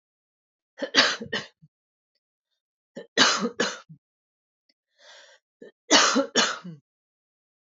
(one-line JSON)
{"three_cough_length": "7.7 s", "three_cough_amplitude": 23805, "three_cough_signal_mean_std_ratio": 0.33, "survey_phase": "beta (2021-08-13 to 2022-03-07)", "age": "18-44", "gender": "Female", "wearing_mask": "No", "symptom_none": true, "symptom_onset": "8 days", "smoker_status": "Never smoked", "respiratory_condition_asthma": false, "respiratory_condition_other": false, "recruitment_source": "REACT", "submission_delay": "2 days", "covid_test_result": "Negative", "covid_test_method": "RT-qPCR", "influenza_a_test_result": "Negative", "influenza_b_test_result": "Negative"}